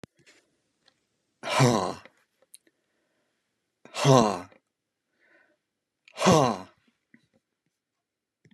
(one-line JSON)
{"exhalation_length": "8.5 s", "exhalation_amplitude": 21592, "exhalation_signal_mean_std_ratio": 0.27, "survey_phase": "beta (2021-08-13 to 2022-03-07)", "age": "65+", "gender": "Male", "wearing_mask": "No", "symptom_none": true, "smoker_status": "Never smoked", "respiratory_condition_asthma": false, "respiratory_condition_other": false, "recruitment_source": "REACT", "submission_delay": "3 days", "covid_test_result": "Negative", "covid_test_method": "RT-qPCR", "influenza_a_test_result": "Negative", "influenza_b_test_result": "Negative"}